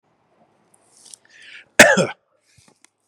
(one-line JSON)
{"three_cough_length": "3.1 s", "three_cough_amplitude": 32768, "three_cough_signal_mean_std_ratio": 0.22, "survey_phase": "beta (2021-08-13 to 2022-03-07)", "age": "45-64", "gender": "Male", "wearing_mask": "No", "symptom_none": true, "symptom_onset": "12 days", "smoker_status": "Never smoked", "respiratory_condition_asthma": false, "respiratory_condition_other": false, "recruitment_source": "REACT", "submission_delay": "2 days", "covid_test_result": "Negative", "covid_test_method": "RT-qPCR", "influenza_a_test_result": "Negative", "influenza_b_test_result": "Negative"}